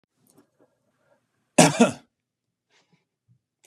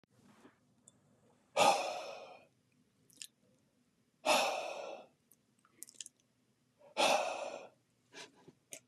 {"cough_length": "3.7 s", "cough_amplitude": 31694, "cough_signal_mean_std_ratio": 0.2, "exhalation_length": "8.9 s", "exhalation_amplitude": 5616, "exhalation_signal_mean_std_ratio": 0.34, "survey_phase": "beta (2021-08-13 to 2022-03-07)", "age": "45-64", "gender": "Male", "wearing_mask": "No", "symptom_none": true, "symptom_onset": "3 days", "smoker_status": "Never smoked", "respiratory_condition_asthma": false, "respiratory_condition_other": false, "recruitment_source": "REACT", "submission_delay": "2 days", "covid_test_result": "Negative", "covid_test_method": "RT-qPCR", "influenza_a_test_result": "Negative", "influenza_b_test_result": "Negative"}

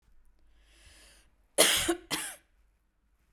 {"cough_length": "3.3 s", "cough_amplitude": 18960, "cough_signal_mean_std_ratio": 0.31, "survey_phase": "beta (2021-08-13 to 2022-03-07)", "age": "45-64", "gender": "Female", "wearing_mask": "No", "symptom_cough_any": true, "smoker_status": "Ex-smoker", "respiratory_condition_asthma": false, "respiratory_condition_other": false, "recruitment_source": "REACT", "submission_delay": "1 day", "covid_test_result": "Negative", "covid_test_method": "RT-qPCR", "influenza_a_test_result": "Negative", "influenza_b_test_result": "Negative"}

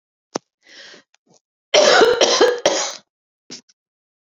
{"three_cough_length": "4.3 s", "three_cough_amplitude": 31955, "three_cough_signal_mean_std_ratio": 0.41, "survey_phase": "beta (2021-08-13 to 2022-03-07)", "age": "18-44", "gender": "Female", "wearing_mask": "No", "symptom_cough_any": true, "symptom_runny_or_blocked_nose": true, "symptom_fatigue": true, "symptom_headache": true, "symptom_change_to_sense_of_smell_or_taste": true, "symptom_onset": "12 days", "smoker_status": "Ex-smoker", "respiratory_condition_asthma": false, "respiratory_condition_other": false, "recruitment_source": "REACT", "submission_delay": "1 day", "covid_test_result": "Positive", "covid_test_method": "RT-qPCR", "covid_ct_value": 23.0, "covid_ct_gene": "E gene"}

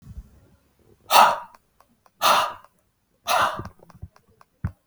{"exhalation_length": "4.9 s", "exhalation_amplitude": 32768, "exhalation_signal_mean_std_ratio": 0.34, "survey_phase": "beta (2021-08-13 to 2022-03-07)", "age": "65+", "gender": "Male", "wearing_mask": "No", "symptom_cough_any": true, "symptom_runny_or_blocked_nose": true, "symptom_change_to_sense_of_smell_or_taste": true, "symptom_onset": "5 days", "smoker_status": "Ex-smoker", "respiratory_condition_asthma": false, "respiratory_condition_other": false, "recruitment_source": "REACT", "submission_delay": "2 days", "covid_test_result": "Negative", "covid_test_method": "RT-qPCR", "influenza_a_test_result": "Unknown/Void", "influenza_b_test_result": "Unknown/Void"}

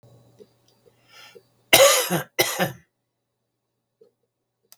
{"cough_length": "4.8 s", "cough_amplitude": 32768, "cough_signal_mean_std_ratio": 0.29, "survey_phase": "beta (2021-08-13 to 2022-03-07)", "age": "65+", "gender": "Male", "wearing_mask": "No", "symptom_cough_any": true, "symptom_fatigue": true, "symptom_other": true, "symptom_onset": "12 days", "smoker_status": "Ex-smoker", "respiratory_condition_asthma": true, "respiratory_condition_other": true, "recruitment_source": "REACT", "submission_delay": "2 days", "covid_test_result": "Negative", "covid_test_method": "RT-qPCR", "influenza_a_test_result": "Negative", "influenza_b_test_result": "Negative"}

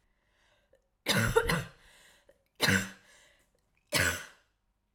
{"three_cough_length": "4.9 s", "three_cough_amplitude": 9717, "three_cough_signal_mean_std_ratio": 0.38, "survey_phase": "alpha (2021-03-01 to 2021-08-12)", "age": "18-44", "gender": "Female", "wearing_mask": "No", "symptom_shortness_of_breath": true, "symptom_headache": true, "symptom_change_to_sense_of_smell_or_taste": true, "symptom_loss_of_taste": true, "symptom_onset": "3 days", "smoker_status": "Ex-smoker", "respiratory_condition_asthma": false, "respiratory_condition_other": false, "recruitment_source": "Test and Trace", "submission_delay": "2 days", "covid_test_result": "Positive", "covid_test_method": "RT-qPCR", "covid_ct_value": 12.4, "covid_ct_gene": "N gene", "covid_ct_mean": 12.7, "covid_viral_load": "70000000 copies/ml", "covid_viral_load_category": "High viral load (>1M copies/ml)"}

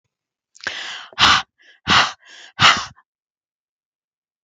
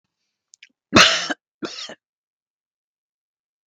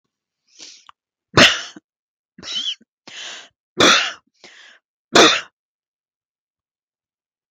{"exhalation_length": "4.4 s", "exhalation_amplitude": 32768, "exhalation_signal_mean_std_ratio": 0.33, "cough_length": "3.7 s", "cough_amplitude": 32768, "cough_signal_mean_std_ratio": 0.24, "three_cough_length": "7.5 s", "three_cough_amplitude": 32768, "three_cough_signal_mean_std_ratio": 0.28, "survey_phase": "beta (2021-08-13 to 2022-03-07)", "age": "45-64", "gender": "Female", "wearing_mask": "No", "symptom_cough_any": true, "symptom_runny_or_blocked_nose": true, "symptom_onset": "12 days", "smoker_status": "Never smoked", "respiratory_condition_asthma": false, "respiratory_condition_other": false, "recruitment_source": "REACT", "submission_delay": "2 days", "covid_test_result": "Negative", "covid_test_method": "RT-qPCR", "influenza_a_test_result": "Negative", "influenza_b_test_result": "Negative"}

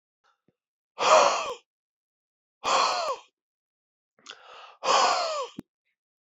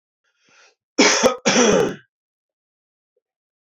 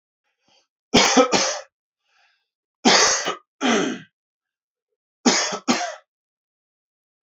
{"exhalation_length": "6.4 s", "exhalation_amplitude": 15520, "exhalation_signal_mean_std_ratio": 0.39, "cough_length": "3.8 s", "cough_amplitude": 27102, "cough_signal_mean_std_ratio": 0.38, "three_cough_length": "7.3 s", "three_cough_amplitude": 28000, "three_cough_signal_mean_std_ratio": 0.39, "survey_phase": "beta (2021-08-13 to 2022-03-07)", "age": "18-44", "gender": "Male", "wearing_mask": "No", "symptom_cough_any": true, "symptom_runny_or_blocked_nose": true, "symptom_fatigue": true, "symptom_headache": true, "symptom_change_to_sense_of_smell_or_taste": true, "symptom_loss_of_taste": true, "symptom_other": true, "symptom_onset": "4 days", "smoker_status": "Never smoked", "respiratory_condition_asthma": false, "respiratory_condition_other": false, "recruitment_source": "REACT", "submission_delay": "1 day", "covid_test_result": "Positive", "covid_test_method": "RT-qPCR", "covid_ct_value": 22.0, "covid_ct_gene": "E gene", "influenza_a_test_result": "Unknown/Void", "influenza_b_test_result": "Unknown/Void"}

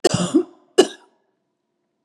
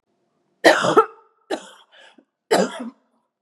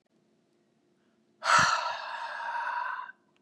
{"cough_length": "2.0 s", "cough_amplitude": 32559, "cough_signal_mean_std_ratio": 0.31, "three_cough_length": "3.4 s", "three_cough_amplitude": 32768, "three_cough_signal_mean_std_ratio": 0.33, "exhalation_length": "3.4 s", "exhalation_amplitude": 10831, "exhalation_signal_mean_std_ratio": 0.48, "survey_phase": "beta (2021-08-13 to 2022-03-07)", "age": "45-64", "gender": "Female", "wearing_mask": "No", "symptom_cough_any": true, "symptom_onset": "12 days", "smoker_status": "Never smoked", "respiratory_condition_asthma": false, "respiratory_condition_other": false, "recruitment_source": "REACT", "submission_delay": "0 days", "covid_test_result": "Negative", "covid_test_method": "RT-qPCR", "influenza_a_test_result": "Negative", "influenza_b_test_result": "Negative"}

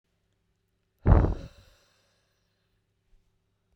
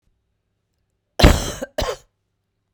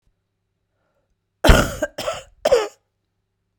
{"exhalation_length": "3.8 s", "exhalation_amplitude": 16878, "exhalation_signal_mean_std_ratio": 0.22, "cough_length": "2.7 s", "cough_amplitude": 32768, "cough_signal_mean_std_ratio": 0.27, "three_cough_length": "3.6 s", "three_cough_amplitude": 32768, "three_cough_signal_mean_std_ratio": 0.3, "survey_phase": "beta (2021-08-13 to 2022-03-07)", "age": "45-64", "gender": "Male", "wearing_mask": "No", "symptom_cough_any": true, "symptom_runny_or_blocked_nose": true, "symptom_headache": true, "symptom_onset": "3 days", "smoker_status": "Ex-smoker", "respiratory_condition_asthma": false, "respiratory_condition_other": false, "recruitment_source": "Test and Trace", "submission_delay": "2 days", "covid_test_result": "Positive", "covid_test_method": "RT-qPCR", "covid_ct_value": 16.0, "covid_ct_gene": "ORF1ab gene", "covid_ct_mean": 16.4, "covid_viral_load": "4300000 copies/ml", "covid_viral_load_category": "High viral load (>1M copies/ml)"}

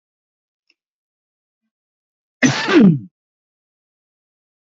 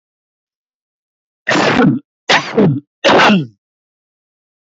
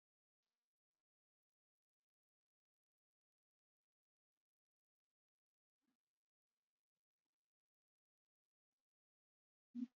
{"cough_length": "4.7 s", "cough_amplitude": 28297, "cough_signal_mean_std_ratio": 0.26, "three_cough_length": "4.6 s", "three_cough_amplitude": 29592, "three_cough_signal_mean_std_ratio": 0.47, "exhalation_length": "10.0 s", "exhalation_amplitude": 450, "exhalation_signal_mean_std_ratio": 0.08, "survey_phase": "beta (2021-08-13 to 2022-03-07)", "age": "65+", "gender": "Male", "wearing_mask": "No", "symptom_none": true, "smoker_status": "Ex-smoker", "respiratory_condition_asthma": false, "respiratory_condition_other": false, "recruitment_source": "REACT", "submission_delay": "2 days", "covid_test_result": "Negative", "covid_test_method": "RT-qPCR"}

